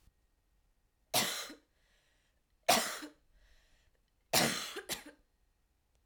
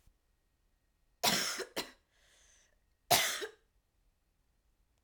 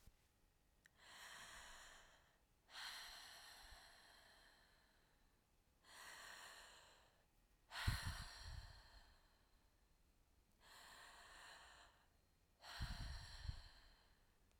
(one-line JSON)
{"three_cough_length": "6.1 s", "three_cough_amplitude": 6837, "three_cough_signal_mean_std_ratio": 0.32, "cough_length": "5.0 s", "cough_amplitude": 9671, "cough_signal_mean_std_ratio": 0.3, "exhalation_length": "14.6 s", "exhalation_amplitude": 1221, "exhalation_signal_mean_std_ratio": 0.49, "survey_phase": "alpha (2021-03-01 to 2021-08-12)", "age": "18-44", "gender": "Female", "wearing_mask": "No", "symptom_cough_any": true, "symptom_change_to_sense_of_smell_or_taste": true, "symptom_onset": "5 days", "smoker_status": "Current smoker (e-cigarettes or vapes only)", "respiratory_condition_asthma": false, "respiratory_condition_other": false, "recruitment_source": "Test and Trace", "submission_delay": "2 days", "covid_test_result": "Positive", "covid_test_method": "RT-qPCR", "covid_ct_value": 15.8, "covid_ct_gene": "ORF1ab gene", "covid_ct_mean": 16.1, "covid_viral_load": "5400000 copies/ml", "covid_viral_load_category": "High viral load (>1M copies/ml)"}